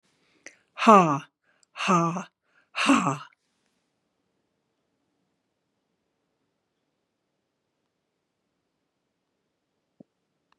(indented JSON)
{
  "exhalation_length": "10.6 s",
  "exhalation_amplitude": 30248,
  "exhalation_signal_mean_std_ratio": 0.22,
  "survey_phase": "beta (2021-08-13 to 2022-03-07)",
  "age": "65+",
  "gender": "Female",
  "wearing_mask": "No",
  "symptom_runny_or_blocked_nose": true,
  "symptom_onset": "12 days",
  "smoker_status": "Ex-smoker",
  "respiratory_condition_asthma": false,
  "respiratory_condition_other": false,
  "recruitment_source": "REACT",
  "submission_delay": "0 days",
  "covid_test_result": "Negative",
  "covid_test_method": "RT-qPCR",
  "influenza_a_test_result": "Negative",
  "influenza_b_test_result": "Negative"
}